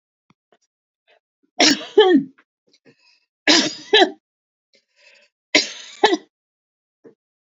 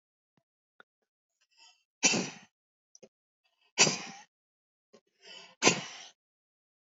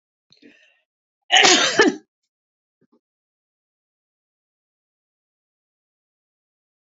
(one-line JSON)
{"three_cough_length": "7.4 s", "three_cough_amplitude": 29574, "three_cough_signal_mean_std_ratio": 0.31, "exhalation_length": "6.9 s", "exhalation_amplitude": 15157, "exhalation_signal_mean_std_ratio": 0.23, "cough_length": "7.0 s", "cough_amplitude": 32768, "cough_signal_mean_std_ratio": 0.22, "survey_phase": "beta (2021-08-13 to 2022-03-07)", "age": "65+", "gender": "Female", "wearing_mask": "No", "symptom_shortness_of_breath": true, "symptom_fatigue": true, "symptom_onset": "11 days", "smoker_status": "Ex-smoker", "respiratory_condition_asthma": false, "respiratory_condition_other": false, "recruitment_source": "REACT", "submission_delay": "3 days", "covid_test_result": "Negative", "covid_test_method": "RT-qPCR", "influenza_a_test_result": "Negative", "influenza_b_test_result": "Negative"}